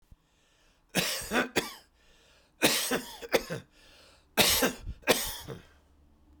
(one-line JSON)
{"three_cough_length": "6.4 s", "three_cough_amplitude": 14993, "three_cough_signal_mean_std_ratio": 0.43, "survey_phase": "beta (2021-08-13 to 2022-03-07)", "age": "65+", "gender": "Male", "wearing_mask": "No", "symptom_none": true, "smoker_status": "Ex-smoker", "respiratory_condition_asthma": false, "respiratory_condition_other": false, "recruitment_source": "REACT", "submission_delay": "3 days", "covid_test_result": "Negative", "covid_test_method": "RT-qPCR", "influenza_a_test_result": "Negative", "influenza_b_test_result": "Negative"}